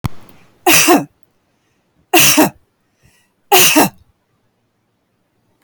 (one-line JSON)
{"three_cough_length": "5.6 s", "three_cough_amplitude": 32768, "three_cough_signal_mean_std_ratio": 0.39, "survey_phase": "beta (2021-08-13 to 2022-03-07)", "age": "65+", "gender": "Female", "wearing_mask": "No", "symptom_none": true, "smoker_status": "Ex-smoker", "respiratory_condition_asthma": false, "respiratory_condition_other": false, "recruitment_source": "REACT", "submission_delay": "2 days", "covid_test_result": "Negative", "covid_test_method": "RT-qPCR"}